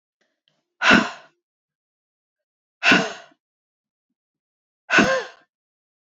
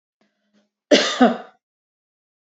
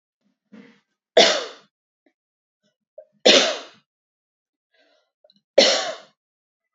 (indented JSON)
{
  "exhalation_length": "6.1 s",
  "exhalation_amplitude": 28510,
  "exhalation_signal_mean_std_ratio": 0.28,
  "cough_length": "2.5 s",
  "cough_amplitude": 27949,
  "cough_signal_mean_std_ratio": 0.29,
  "three_cough_length": "6.7 s",
  "three_cough_amplitude": 30588,
  "three_cough_signal_mean_std_ratio": 0.27,
  "survey_phase": "beta (2021-08-13 to 2022-03-07)",
  "age": "18-44",
  "gender": "Female",
  "wearing_mask": "No",
  "symptom_none": true,
  "smoker_status": "Never smoked",
  "respiratory_condition_asthma": false,
  "respiratory_condition_other": false,
  "recruitment_source": "REACT",
  "submission_delay": "0 days",
  "covid_test_result": "Negative",
  "covid_test_method": "RT-qPCR",
  "influenza_a_test_result": "Negative",
  "influenza_b_test_result": "Negative"
}